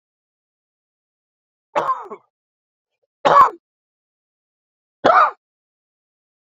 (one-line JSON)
{"three_cough_length": "6.5 s", "three_cough_amplitude": 32767, "three_cough_signal_mean_std_ratio": 0.25, "survey_phase": "beta (2021-08-13 to 2022-03-07)", "age": "45-64", "gender": "Male", "wearing_mask": "No", "symptom_cough_any": true, "symptom_runny_or_blocked_nose": true, "symptom_sore_throat": true, "symptom_abdominal_pain": true, "symptom_fatigue": true, "symptom_fever_high_temperature": true, "symptom_headache": true, "symptom_other": true, "smoker_status": "Never smoked", "respiratory_condition_asthma": false, "respiratory_condition_other": false, "recruitment_source": "Test and Trace", "submission_delay": "1 day", "covid_test_result": "Positive", "covid_test_method": "LFT"}